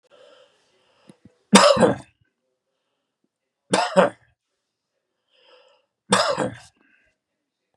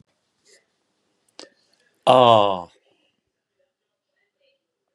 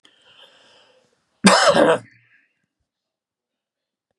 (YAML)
three_cough_length: 7.8 s
three_cough_amplitude: 32768
three_cough_signal_mean_std_ratio: 0.28
exhalation_length: 4.9 s
exhalation_amplitude: 31934
exhalation_signal_mean_std_ratio: 0.22
cough_length: 4.2 s
cough_amplitude: 32288
cough_signal_mean_std_ratio: 0.29
survey_phase: beta (2021-08-13 to 2022-03-07)
age: 65+
gender: Male
wearing_mask: 'No'
symptom_none: true
smoker_status: Ex-smoker
respiratory_condition_asthma: false
respiratory_condition_other: false
recruitment_source: REACT
submission_delay: 2 days
covid_test_result: Negative
covid_test_method: RT-qPCR
influenza_a_test_result: Negative
influenza_b_test_result: Negative